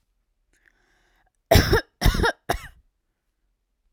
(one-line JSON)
{"three_cough_length": "3.9 s", "three_cough_amplitude": 27233, "three_cough_signal_mean_std_ratio": 0.3, "survey_phase": "alpha (2021-03-01 to 2021-08-12)", "age": "18-44", "gender": "Female", "wearing_mask": "No", "symptom_none": true, "smoker_status": "Never smoked", "respiratory_condition_asthma": false, "respiratory_condition_other": false, "recruitment_source": "REACT", "submission_delay": "1 day", "covid_test_result": "Negative", "covid_test_method": "RT-qPCR"}